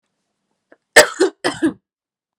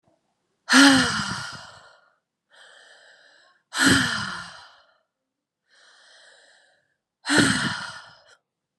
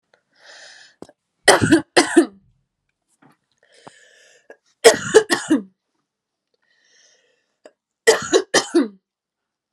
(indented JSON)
{
  "cough_length": "2.4 s",
  "cough_amplitude": 32768,
  "cough_signal_mean_std_ratio": 0.28,
  "exhalation_length": "8.8 s",
  "exhalation_amplitude": 30309,
  "exhalation_signal_mean_std_ratio": 0.35,
  "three_cough_length": "9.7 s",
  "three_cough_amplitude": 32768,
  "three_cough_signal_mean_std_ratio": 0.29,
  "survey_phase": "beta (2021-08-13 to 2022-03-07)",
  "age": "18-44",
  "gender": "Female",
  "wearing_mask": "No",
  "symptom_runny_or_blocked_nose": true,
  "symptom_sore_throat": true,
  "symptom_headache": true,
  "smoker_status": "Never smoked",
  "respiratory_condition_asthma": false,
  "respiratory_condition_other": false,
  "recruitment_source": "Test and Trace",
  "submission_delay": "1 day",
  "covid_test_result": "Positive",
  "covid_test_method": "ePCR"
}